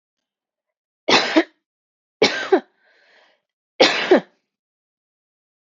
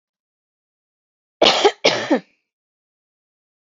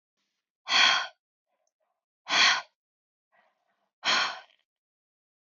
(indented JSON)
{
  "three_cough_length": "5.7 s",
  "three_cough_amplitude": 29020,
  "three_cough_signal_mean_std_ratio": 0.3,
  "cough_length": "3.7 s",
  "cough_amplitude": 27587,
  "cough_signal_mean_std_ratio": 0.29,
  "exhalation_length": "5.5 s",
  "exhalation_amplitude": 13459,
  "exhalation_signal_mean_std_ratio": 0.33,
  "survey_phase": "beta (2021-08-13 to 2022-03-07)",
  "age": "18-44",
  "gender": "Female",
  "wearing_mask": "No",
  "symptom_none": true,
  "smoker_status": "Never smoked",
  "respiratory_condition_asthma": true,
  "respiratory_condition_other": false,
  "recruitment_source": "REACT",
  "submission_delay": "1 day",
  "covid_test_result": "Negative",
  "covid_test_method": "RT-qPCR"
}